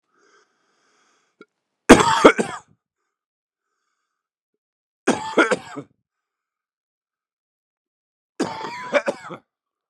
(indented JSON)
{
  "three_cough_length": "9.9 s",
  "three_cough_amplitude": 32768,
  "three_cough_signal_mean_std_ratio": 0.23,
  "survey_phase": "beta (2021-08-13 to 2022-03-07)",
  "age": "18-44",
  "gender": "Male",
  "wearing_mask": "No",
  "symptom_cough_any": true,
  "symptom_new_continuous_cough": true,
  "symptom_runny_or_blocked_nose": true,
  "symptom_headache": true,
  "symptom_change_to_sense_of_smell_or_taste": true,
  "symptom_loss_of_taste": true,
  "symptom_onset": "4 days",
  "smoker_status": "Never smoked",
  "respiratory_condition_asthma": false,
  "respiratory_condition_other": false,
  "recruitment_source": "Test and Trace",
  "submission_delay": "2 days",
  "covid_test_result": "Positive",
  "covid_test_method": "RT-qPCR",
  "covid_ct_value": 14.6,
  "covid_ct_gene": "ORF1ab gene",
  "covid_ct_mean": 15.6,
  "covid_viral_load": "7400000 copies/ml",
  "covid_viral_load_category": "High viral load (>1M copies/ml)"
}